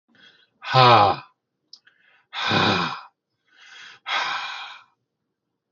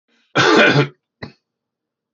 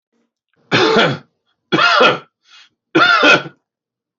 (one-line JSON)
{"exhalation_length": "5.7 s", "exhalation_amplitude": 25350, "exhalation_signal_mean_std_ratio": 0.38, "cough_length": "2.1 s", "cough_amplitude": 28052, "cough_signal_mean_std_ratio": 0.42, "three_cough_length": "4.2 s", "three_cough_amplitude": 29535, "three_cough_signal_mean_std_ratio": 0.49, "survey_phase": "beta (2021-08-13 to 2022-03-07)", "age": "65+", "gender": "Male", "wearing_mask": "No", "symptom_none": true, "smoker_status": "Ex-smoker", "respiratory_condition_asthma": false, "respiratory_condition_other": true, "recruitment_source": "REACT", "submission_delay": "1 day", "covid_test_result": "Negative", "covid_test_method": "RT-qPCR", "influenza_a_test_result": "Negative", "influenza_b_test_result": "Negative"}